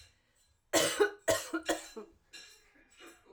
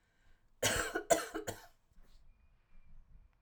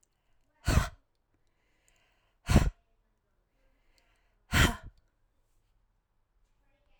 {"three_cough_length": "3.3 s", "three_cough_amplitude": 6011, "three_cough_signal_mean_std_ratio": 0.39, "cough_length": "3.4 s", "cough_amplitude": 6222, "cough_signal_mean_std_ratio": 0.37, "exhalation_length": "7.0 s", "exhalation_amplitude": 12868, "exhalation_signal_mean_std_ratio": 0.23, "survey_phase": "alpha (2021-03-01 to 2021-08-12)", "age": "45-64", "gender": "Female", "wearing_mask": "No", "symptom_none": true, "smoker_status": "Never smoked", "respiratory_condition_asthma": false, "respiratory_condition_other": false, "recruitment_source": "REACT", "submission_delay": "3 days", "covid_test_result": "Negative", "covid_test_method": "RT-qPCR"}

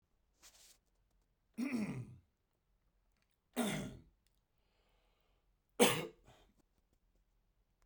{"three_cough_length": "7.9 s", "three_cough_amplitude": 7156, "three_cough_signal_mean_std_ratio": 0.27, "survey_phase": "beta (2021-08-13 to 2022-03-07)", "age": "45-64", "gender": "Male", "wearing_mask": "No", "symptom_sore_throat": true, "symptom_other": true, "symptom_onset": "11 days", "smoker_status": "Never smoked", "respiratory_condition_asthma": false, "respiratory_condition_other": false, "recruitment_source": "REACT", "submission_delay": "2 days", "covid_test_result": "Negative", "covid_test_method": "RT-qPCR"}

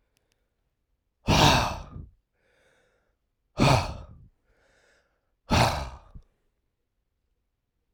{"exhalation_length": "7.9 s", "exhalation_amplitude": 17622, "exhalation_signal_mean_std_ratio": 0.31, "survey_phase": "beta (2021-08-13 to 2022-03-07)", "age": "18-44", "gender": "Male", "wearing_mask": "No", "symptom_sore_throat": true, "smoker_status": "Ex-smoker", "respiratory_condition_asthma": false, "respiratory_condition_other": false, "recruitment_source": "Test and Trace", "submission_delay": "5 days", "covid_test_result": "Negative", "covid_test_method": "RT-qPCR"}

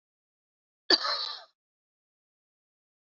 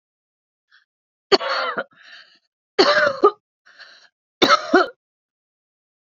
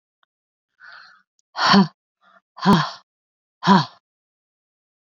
{"cough_length": "3.2 s", "cough_amplitude": 12716, "cough_signal_mean_std_ratio": 0.23, "three_cough_length": "6.1 s", "three_cough_amplitude": 30892, "three_cough_signal_mean_std_ratio": 0.33, "exhalation_length": "5.1 s", "exhalation_amplitude": 27455, "exhalation_signal_mean_std_ratio": 0.3, "survey_phase": "beta (2021-08-13 to 2022-03-07)", "age": "45-64", "gender": "Female", "wearing_mask": "No", "symptom_cough_any": true, "symptom_new_continuous_cough": true, "symptom_runny_or_blocked_nose": true, "symptom_headache": true, "smoker_status": "Ex-smoker", "respiratory_condition_asthma": true, "respiratory_condition_other": false, "recruitment_source": "Test and Trace", "submission_delay": "1 day", "covid_test_result": "Positive", "covid_test_method": "RT-qPCR", "covid_ct_value": 24.8, "covid_ct_gene": "ORF1ab gene"}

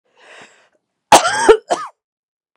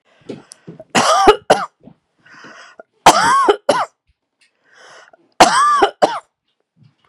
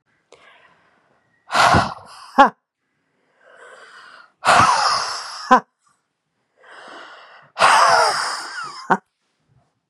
{"cough_length": "2.6 s", "cough_amplitude": 32768, "cough_signal_mean_std_ratio": 0.32, "three_cough_length": "7.1 s", "three_cough_amplitude": 32768, "three_cough_signal_mean_std_ratio": 0.41, "exhalation_length": "9.9 s", "exhalation_amplitude": 32768, "exhalation_signal_mean_std_ratio": 0.39, "survey_phase": "beta (2021-08-13 to 2022-03-07)", "age": "45-64", "gender": "Female", "wearing_mask": "No", "symptom_none": true, "smoker_status": "Ex-smoker", "respiratory_condition_asthma": false, "respiratory_condition_other": false, "recruitment_source": "REACT", "submission_delay": "1 day", "covid_test_result": "Negative", "covid_test_method": "RT-qPCR", "influenza_a_test_result": "Unknown/Void", "influenza_b_test_result": "Unknown/Void"}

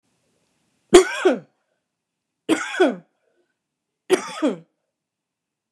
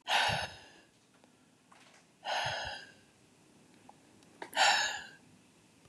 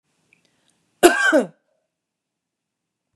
{"three_cough_length": "5.7 s", "three_cough_amplitude": 32768, "three_cough_signal_mean_std_ratio": 0.28, "exhalation_length": "5.9 s", "exhalation_amplitude": 6641, "exhalation_signal_mean_std_ratio": 0.4, "cough_length": "3.2 s", "cough_amplitude": 32767, "cough_signal_mean_std_ratio": 0.26, "survey_phase": "beta (2021-08-13 to 2022-03-07)", "age": "45-64", "gender": "Female", "wearing_mask": "No", "symptom_none": true, "smoker_status": "Never smoked", "respiratory_condition_asthma": false, "respiratory_condition_other": false, "recruitment_source": "REACT", "submission_delay": "1 day", "covid_test_method": "RT-qPCR", "influenza_a_test_result": "Negative", "influenza_b_test_result": "Negative"}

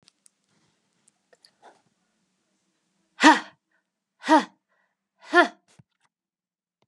{"exhalation_length": "6.9 s", "exhalation_amplitude": 27916, "exhalation_signal_mean_std_ratio": 0.19, "survey_phase": "beta (2021-08-13 to 2022-03-07)", "age": "45-64", "gender": "Female", "wearing_mask": "No", "symptom_none": true, "smoker_status": "Never smoked", "respiratory_condition_asthma": false, "respiratory_condition_other": false, "recruitment_source": "REACT", "submission_delay": "2 days", "covid_test_result": "Negative", "covid_test_method": "RT-qPCR", "influenza_a_test_result": "Negative", "influenza_b_test_result": "Negative"}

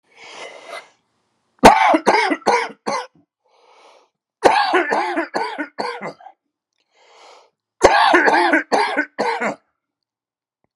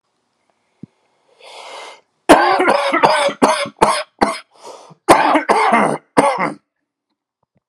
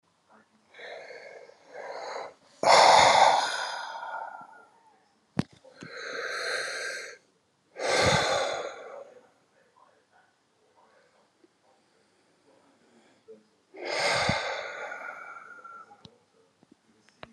{"three_cough_length": "10.8 s", "three_cough_amplitude": 32768, "three_cough_signal_mean_std_ratio": 0.45, "cough_length": "7.7 s", "cough_amplitude": 32768, "cough_signal_mean_std_ratio": 0.48, "exhalation_length": "17.3 s", "exhalation_amplitude": 18674, "exhalation_signal_mean_std_ratio": 0.38, "survey_phase": "alpha (2021-03-01 to 2021-08-12)", "age": "45-64", "gender": "Male", "wearing_mask": "No", "symptom_none": true, "smoker_status": "Never smoked", "respiratory_condition_asthma": true, "respiratory_condition_other": false, "recruitment_source": "REACT", "submission_delay": "2 days", "covid_test_result": "Negative", "covid_test_method": "RT-qPCR"}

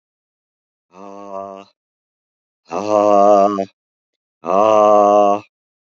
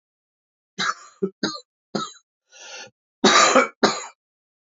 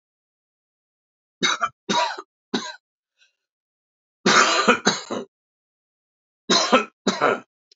{"exhalation_length": "5.9 s", "exhalation_amplitude": 27625, "exhalation_signal_mean_std_ratio": 0.46, "cough_length": "4.8 s", "cough_amplitude": 32496, "cough_signal_mean_std_ratio": 0.35, "three_cough_length": "7.8 s", "three_cough_amplitude": 28250, "three_cough_signal_mean_std_ratio": 0.38, "survey_phase": "beta (2021-08-13 to 2022-03-07)", "age": "45-64", "gender": "Male", "wearing_mask": "No", "symptom_cough_any": true, "symptom_sore_throat": true, "symptom_onset": "3 days", "smoker_status": "Never smoked", "respiratory_condition_asthma": false, "respiratory_condition_other": false, "recruitment_source": "Test and Trace", "submission_delay": "1 day", "covid_test_result": "Positive", "covid_test_method": "RT-qPCR", "covid_ct_value": 16.8, "covid_ct_gene": "ORF1ab gene", "covid_ct_mean": 17.6, "covid_viral_load": "1700000 copies/ml", "covid_viral_load_category": "High viral load (>1M copies/ml)"}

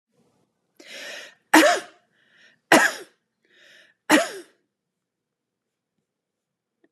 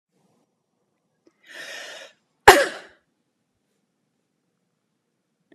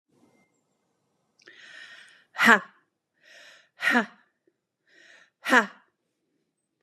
{"three_cough_length": "6.9 s", "three_cough_amplitude": 30912, "three_cough_signal_mean_std_ratio": 0.25, "cough_length": "5.5 s", "cough_amplitude": 32768, "cough_signal_mean_std_ratio": 0.15, "exhalation_length": "6.8 s", "exhalation_amplitude": 27396, "exhalation_signal_mean_std_ratio": 0.22, "survey_phase": "beta (2021-08-13 to 2022-03-07)", "age": "45-64", "gender": "Female", "wearing_mask": "No", "symptom_cough_any": true, "smoker_status": "Ex-smoker", "respiratory_condition_asthma": false, "respiratory_condition_other": false, "recruitment_source": "Test and Trace", "submission_delay": "2 days", "covid_test_result": "Positive", "covid_test_method": "RT-qPCR", "covid_ct_value": 23.6, "covid_ct_gene": "ORF1ab gene", "covid_ct_mean": 23.8, "covid_viral_load": "16000 copies/ml", "covid_viral_load_category": "Low viral load (10K-1M copies/ml)"}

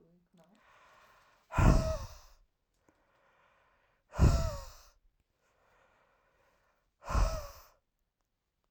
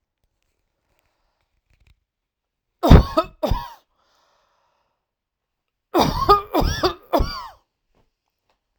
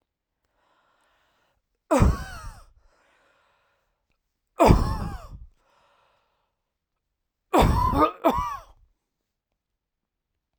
{"exhalation_length": "8.7 s", "exhalation_amplitude": 9280, "exhalation_signal_mean_std_ratio": 0.29, "cough_length": "8.8 s", "cough_amplitude": 32768, "cough_signal_mean_std_ratio": 0.28, "three_cough_length": "10.6 s", "three_cough_amplitude": 28664, "three_cough_signal_mean_std_ratio": 0.31, "survey_phase": "alpha (2021-03-01 to 2021-08-12)", "age": "18-44", "gender": "Male", "wearing_mask": "No", "symptom_none": true, "smoker_status": "Ex-smoker", "respiratory_condition_asthma": false, "respiratory_condition_other": false, "recruitment_source": "REACT", "submission_delay": "1 day", "covid_test_result": "Negative", "covid_test_method": "RT-qPCR"}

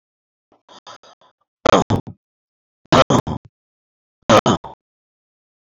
{"cough_length": "5.8 s", "cough_amplitude": 28946, "cough_signal_mean_std_ratio": 0.28, "survey_phase": "beta (2021-08-13 to 2022-03-07)", "age": "45-64", "gender": "Male", "wearing_mask": "No", "symptom_cough_any": true, "symptom_runny_or_blocked_nose": true, "smoker_status": "Ex-smoker", "respiratory_condition_asthma": false, "respiratory_condition_other": false, "recruitment_source": "Test and Trace", "submission_delay": "2 days", "covid_test_result": "Positive", "covid_test_method": "RT-qPCR", "covid_ct_value": 20.8, "covid_ct_gene": "N gene", "covid_ct_mean": 21.7, "covid_viral_load": "78000 copies/ml", "covid_viral_load_category": "Low viral load (10K-1M copies/ml)"}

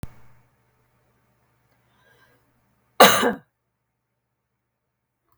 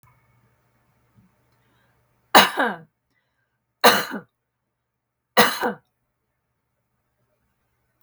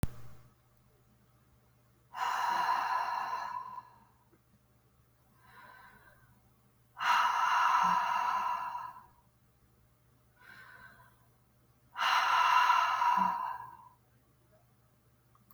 {"cough_length": "5.4 s", "cough_amplitude": 32768, "cough_signal_mean_std_ratio": 0.18, "three_cough_length": "8.0 s", "three_cough_amplitude": 32768, "three_cough_signal_mean_std_ratio": 0.23, "exhalation_length": "15.5 s", "exhalation_amplitude": 6623, "exhalation_signal_mean_std_ratio": 0.5, "survey_phase": "beta (2021-08-13 to 2022-03-07)", "age": "45-64", "gender": "Female", "wearing_mask": "No", "symptom_none": true, "smoker_status": "Never smoked", "respiratory_condition_asthma": false, "respiratory_condition_other": false, "recruitment_source": "REACT", "submission_delay": "2 days", "covid_test_result": "Negative", "covid_test_method": "RT-qPCR", "influenza_a_test_result": "Negative", "influenza_b_test_result": "Negative"}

